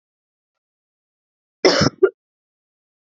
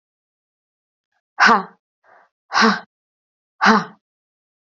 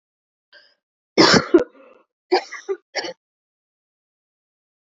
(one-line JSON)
{"cough_length": "3.1 s", "cough_amplitude": 30436, "cough_signal_mean_std_ratio": 0.24, "exhalation_length": "4.6 s", "exhalation_amplitude": 29597, "exhalation_signal_mean_std_ratio": 0.3, "three_cough_length": "4.9 s", "three_cough_amplitude": 28456, "three_cough_signal_mean_std_ratio": 0.27, "survey_phase": "beta (2021-08-13 to 2022-03-07)", "age": "18-44", "gender": "Female", "wearing_mask": "No", "symptom_cough_any": true, "symptom_new_continuous_cough": true, "symptom_runny_or_blocked_nose": true, "symptom_shortness_of_breath": true, "symptom_sore_throat": true, "symptom_fatigue": true, "symptom_headache": true, "symptom_onset": "3 days", "smoker_status": "Never smoked", "respiratory_condition_asthma": false, "respiratory_condition_other": false, "recruitment_source": "Test and Trace", "submission_delay": "1 day", "covid_test_result": "Positive", "covid_test_method": "RT-qPCR", "covid_ct_value": 23.9, "covid_ct_gene": "ORF1ab gene", "covid_ct_mean": 24.3, "covid_viral_load": "11000 copies/ml", "covid_viral_load_category": "Low viral load (10K-1M copies/ml)"}